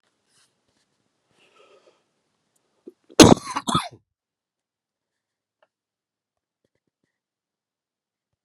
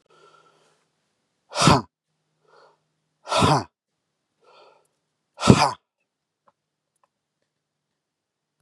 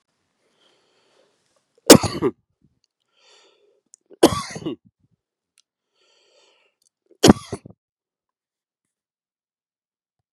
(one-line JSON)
{"cough_length": "8.4 s", "cough_amplitude": 32768, "cough_signal_mean_std_ratio": 0.13, "exhalation_length": "8.6 s", "exhalation_amplitude": 32768, "exhalation_signal_mean_std_ratio": 0.23, "three_cough_length": "10.3 s", "three_cough_amplitude": 32768, "three_cough_signal_mean_std_ratio": 0.15, "survey_phase": "beta (2021-08-13 to 2022-03-07)", "age": "45-64", "gender": "Male", "wearing_mask": "No", "symptom_cough_any": true, "symptom_shortness_of_breath": true, "symptom_fatigue": true, "symptom_onset": "5 days", "smoker_status": "Ex-smoker", "respiratory_condition_asthma": false, "respiratory_condition_other": false, "recruitment_source": "Test and Trace", "submission_delay": "2 days", "covid_test_result": "Positive", "covid_test_method": "ePCR"}